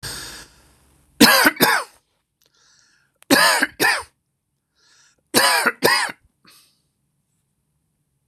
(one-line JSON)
{"three_cough_length": "8.3 s", "three_cough_amplitude": 26028, "three_cough_signal_mean_std_ratio": 0.37, "survey_phase": "beta (2021-08-13 to 2022-03-07)", "age": "45-64", "gender": "Male", "wearing_mask": "No", "symptom_none": true, "smoker_status": "Never smoked", "respiratory_condition_asthma": false, "respiratory_condition_other": false, "recruitment_source": "REACT", "submission_delay": "4 days", "covid_test_result": "Negative", "covid_test_method": "RT-qPCR", "influenza_a_test_result": "Negative", "influenza_b_test_result": "Negative"}